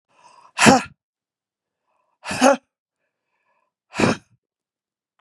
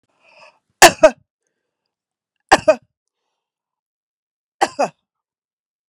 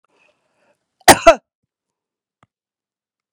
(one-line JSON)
{"exhalation_length": "5.2 s", "exhalation_amplitude": 32768, "exhalation_signal_mean_std_ratio": 0.26, "three_cough_length": "5.9 s", "three_cough_amplitude": 32768, "three_cough_signal_mean_std_ratio": 0.2, "cough_length": "3.3 s", "cough_amplitude": 32768, "cough_signal_mean_std_ratio": 0.18, "survey_phase": "beta (2021-08-13 to 2022-03-07)", "age": "65+", "gender": "Female", "wearing_mask": "No", "symptom_runny_or_blocked_nose": true, "symptom_shortness_of_breath": true, "symptom_fatigue": true, "smoker_status": "Never smoked", "respiratory_condition_asthma": false, "respiratory_condition_other": false, "recruitment_source": "REACT", "submission_delay": "1 day", "covid_test_result": "Negative", "covid_test_method": "RT-qPCR", "influenza_a_test_result": "Negative", "influenza_b_test_result": "Negative"}